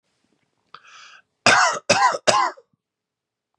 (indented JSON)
{
  "three_cough_length": "3.6 s",
  "three_cough_amplitude": 31466,
  "three_cough_signal_mean_std_ratio": 0.38,
  "survey_phase": "beta (2021-08-13 to 2022-03-07)",
  "age": "18-44",
  "gender": "Male",
  "wearing_mask": "No",
  "symptom_cough_any": true,
  "symptom_runny_or_blocked_nose": true,
  "symptom_fatigue": true,
  "symptom_other": true,
  "smoker_status": "Never smoked",
  "respiratory_condition_asthma": false,
  "respiratory_condition_other": false,
  "recruitment_source": "Test and Trace",
  "submission_delay": "1 day",
  "covid_test_result": "Positive",
  "covid_test_method": "RT-qPCR",
  "covid_ct_value": 27.1,
  "covid_ct_gene": "N gene"
}